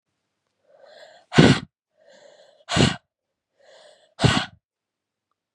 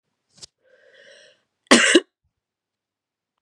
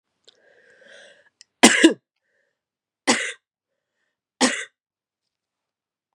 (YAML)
exhalation_length: 5.5 s
exhalation_amplitude: 31256
exhalation_signal_mean_std_ratio: 0.26
cough_length: 3.4 s
cough_amplitude: 32767
cough_signal_mean_std_ratio: 0.23
three_cough_length: 6.1 s
three_cough_amplitude: 32768
three_cough_signal_mean_std_ratio: 0.22
survey_phase: beta (2021-08-13 to 2022-03-07)
age: 18-44
gender: Female
wearing_mask: 'No'
symptom_cough_any: true
symptom_runny_or_blocked_nose: true
symptom_sore_throat: true
symptom_fatigue: true
symptom_headache: true
symptom_onset: 11 days
smoker_status: Never smoked
respiratory_condition_asthma: false
respiratory_condition_other: false
recruitment_source: Test and Trace
submission_delay: 11 days
covid_test_result: Negative
covid_test_method: RT-qPCR